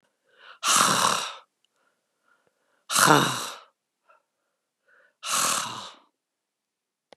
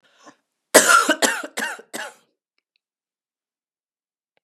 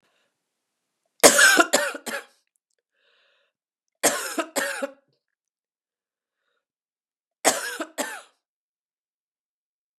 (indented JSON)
{
  "exhalation_length": "7.2 s",
  "exhalation_amplitude": 29247,
  "exhalation_signal_mean_std_ratio": 0.36,
  "cough_length": "4.4 s",
  "cough_amplitude": 32768,
  "cough_signal_mean_std_ratio": 0.29,
  "three_cough_length": "10.0 s",
  "three_cough_amplitude": 32768,
  "three_cough_signal_mean_std_ratio": 0.27,
  "survey_phase": "beta (2021-08-13 to 2022-03-07)",
  "age": "65+",
  "gender": "Female",
  "wearing_mask": "No",
  "symptom_cough_any": true,
  "symptom_runny_or_blocked_nose": true,
  "symptom_onset": "3 days",
  "smoker_status": "Never smoked",
  "respiratory_condition_asthma": false,
  "respiratory_condition_other": false,
  "recruitment_source": "Test and Trace",
  "submission_delay": "1 day",
  "covid_test_result": "Positive",
  "covid_test_method": "RT-qPCR",
  "covid_ct_value": 20.8,
  "covid_ct_gene": "ORF1ab gene"
}